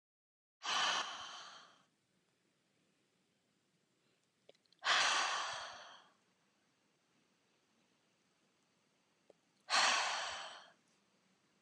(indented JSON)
{
  "exhalation_length": "11.6 s",
  "exhalation_amplitude": 3684,
  "exhalation_signal_mean_std_ratio": 0.35,
  "survey_phase": "beta (2021-08-13 to 2022-03-07)",
  "age": "45-64",
  "gender": "Female",
  "wearing_mask": "No",
  "symptom_none": true,
  "symptom_onset": "11 days",
  "smoker_status": "Never smoked",
  "respiratory_condition_asthma": false,
  "respiratory_condition_other": false,
  "recruitment_source": "REACT",
  "submission_delay": "6 days",
  "covid_test_result": "Negative",
  "covid_test_method": "RT-qPCR",
  "influenza_a_test_result": "Negative",
  "influenza_b_test_result": "Negative"
}